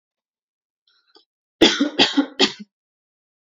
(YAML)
three_cough_length: 3.5 s
three_cough_amplitude: 29809
three_cough_signal_mean_std_ratio: 0.31
survey_phase: beta (2021-08-13 to 2022-03-07)
age: 18-44
gender: Female
wearing_mask: 'No'
symptom_none: true
smoker_status: Never smoked
respiratory_condition_asthma: false
respiratory_condition_other: false
recruitment_source: REACT
submission_delay: 0 days
covid_test_result: Negative
covid_test_method: RT-qPCR